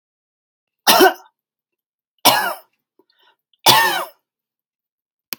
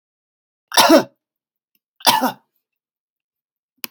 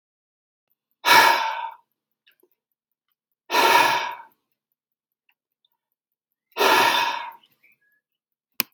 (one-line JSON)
{"three_cough_length": "5.4 s", "three_cough_amplitude": 32768, "three_cough_signal_mean_std_ratio": 0.31, "cough_length": "3.9 s", "cough_amplitude": 32767, "cough_signal_mean_std_ratio": 0.28, "exhalation_length": "8.7 s", "exhalation_amplitude": 32767, "exhalation_signal_mean_std_ratio": 0.35, "survey_phase": "alpha (2021-03-01 to 2021-08-12)", "age": "45-64", "gender": "Male", "wearing_mask": "No", "symptom_none": true, "smoker_status": "Never smoked", "respiratory_condition_asthma": false, "respiratory_condition_other": false, "recruitment_source": "REACT", "submission_delay": "1 day", "covid_test_result": "Negative", "covid_test_method": "RT-qPCR"}